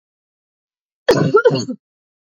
{"cough_length": "2.4 s", "cough_amplitude": 26378, "cough_signal_mean_std_ratio": 0.37, "survey_phase": "beta (2021-08-13 to 2022-03-07)", "age": "45-64", "gender": "Female", "wearing_mask": "No", "symptom_cough_any": true, "symptom_sore_throat": true, "symptom_fatigue": true, "symptom_headache": true, "symptom_onset": "3 days", "smoker_status": "Ex-smoker", "respiratory_condition_asthma": true, "respiratory_condition_other": false, "recruitment_source": "Test and Trace", "submission_delay": "2 days", "covid_test_result": "Positive", "covid_test_method": "RT-qPCR"}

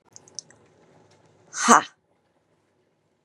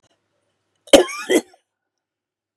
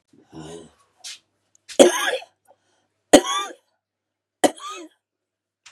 {"exhalation_length": "3.2 s", "exhalation_amplitude": 32767, "exhalation_signal_mean_std_ratio": 0.19, "cough_length": "2.6 s", "cough_amplitude": 32768, "cough_signal_mean_std_ratio": 0.23, "three_cough_length": "5.7 s", "three_cough_amplitude": 32768, "three_cough_signal_mean_std_ratio": 0.25, "survey_phase": "beta (2021-08-13 to 2022-03-07)", "age": "45-64", "gender": "Female", "wearing_mask": "No", "symptom_cough_any": true, "symptom_runny_or_blocked_nose": true, "symptom_sore_throat": true, "symptom_abdominal_pain": true, "symptom_fatigue": true, "symptom_fever_high_temperature": true, "symptom_headache": true, "symptom_onset": "7 days", "smoker_status": "Ex-smoker", "respiratory_condition_asthma": true, "respiratory_condition_other": false, "recruitment_source": "Test and Trace", "submission_delay": "2 days", "covid_test_result": "Positive", "covid_test_method": "RT-qPCR", "covid_ct_value": 16.7, "covid_ct_gene": "N gene"}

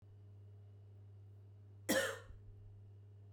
{"cough_length": "3.3 s", "cough_amplitude": 2417, "cough_signal_mean_std_ratio": 0.47, "survey_phase": "beta (2021-08-13 to 2022-03-07)", "age": "45-64", "gender": "Female", "wearing_mask": "No", "symptom_none": true, "smoker_status": "Current smoker (1 to 10 cigarettes per day)", "respiratory_condition_asthma": false, "respiratory_condition_other": false, "recruitment_source": "REACT", "submission_delay": "14 days", "covid_test_result": "Negative", "covid_test_method": "RT-qPCR"}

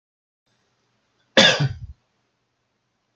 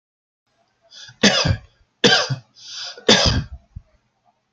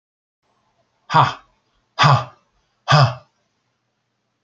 {"cough_length": "3.2 s", "cough_amplitude": 29368, "cough_signal_mean_std_ratio": 0.25, "three_cough_length": "4.5 s", "three_cough_amplitude": 31458, "three_cough_signal_mean_std_ratio": 0.39, "exhalation_length": "4.4 s", "exhalation_amplitude": 32767, "exhalation_signal_mean_std_ratio": 0.31, "survey_phase": "beta (2021-08-13 to 2022-03-07)", "age": "65+", "gender": "Male", "wearing_mask": "No", "symptom_none": true, "smoker_status": "Never smoked", "respiratory_condition_asthma": false, "respiratory_condition_other": false, "recruitment_source": "REACT", "submission_delay": "8 days", "covid_test_result": "Negative", "covid_test_method": "RT-qPCR"}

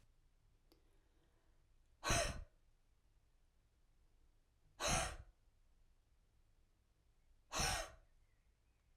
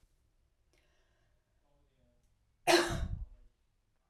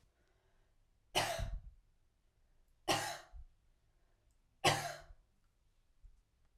{"exhalation_length": "9.0 s", "exhalation_amplitude": 1896, "exhalation_signal_mean_std_ratio": 0.31, "cough_length": "4.1 s", "cough_amplitude": 7064, "cough_signal_mean_std_ratio": 0.26, "three_cough_length": "6.6 s", "three_cough_amplitude": 5372, "three_cough_signal_mean_std_ratio": 0.32, "survey_phase": "alpha (2021-03-01 to 2021-08-12)", "age": "45-64", "gender": "Female", "wearing_mask": "No", "symptom_none": true, "smoker_status": "Never smoked", "respiratory_condition_asthma": false, "respiratory_condition_other": false, "recruitment_source": "REACT", "submission_delay": "1 day", "covid_test_result": "Negative", "covid_test_method": "RT-qPCR"}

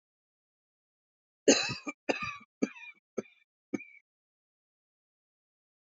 {"cough_length": "5.9 s", "cough_amplitude": 12131, "cough_signal_mean_std_ratio": 0.22, "survey_phase": "beta (2021-08-13 to 2022-03-07)", "age": "45-64", "gender": "Female", "wearing_mask": "No", "symptom_none": true, "smoker_status": "Ex-smoker", "respiratory_condition_asthma": false, "respiratory_condition_other": false, "recruitment_source": "REACT", "submission_delay": "4 days", "covid_test_result": "Negative", "covid_test_method": "RT-qPCR", "influenza_a_test_result": "Negative", "influenza_b_test_result": "Negative"}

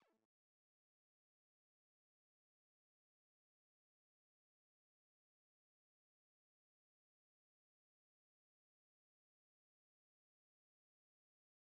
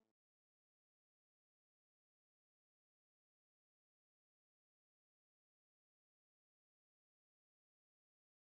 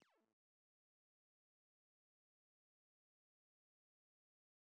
{"exhalation_length": "11.8 s", "exhalation_amplitude": 27, "exhalation_signal_mean_std_ratio": 0.09, "three_cough_length": "8.5 s", "three_cough_amplitude": 5, "three_cough_signal_mean_std_ratio": 0.07, "cough_length": "4.6 s", "cough_amplitude": 72, "cough_signal_mean_std_ratio": 0.15, "survey_phase": "beta (2021-08-13 to 2022-03-07)", "age": "65+", "gender": "Female", "wearing_mask": "No", "symptom_none": true, "smoker_status": "Never smoked", "respiratory_condition_asthma": false, "respiratory_condition_other": true, "recruitment_source": "REACT", "submission_delay": "2 days", "covid_test_result": "Negative", "covid_test_method": "RT-qPCR"}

